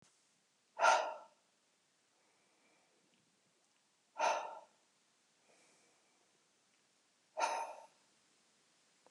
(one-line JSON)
{"exhalation_length": "9.1 s", "exhalation_amplitude": 5592, "exhalation_signal_mean_std_ratio": 0.26, "survey_phase": "beta (2021-08-13 to 2022-03-07)", "age": "45-64", "gender": "Male", "wearing_mask": "No", "symptom_none": true, "smoker_status": "Ex-smoker", "respiratory_condition_asthma": false, "respiratory_condition_other": false, "recruitment_source": "REACT", "submission_delay": "20 days", "covid_test_result": "Negative", "covid_test_method": "RT-qPCR", "influenza_a_test_result": "Negative", "influenza_b_test_result": "Negative"}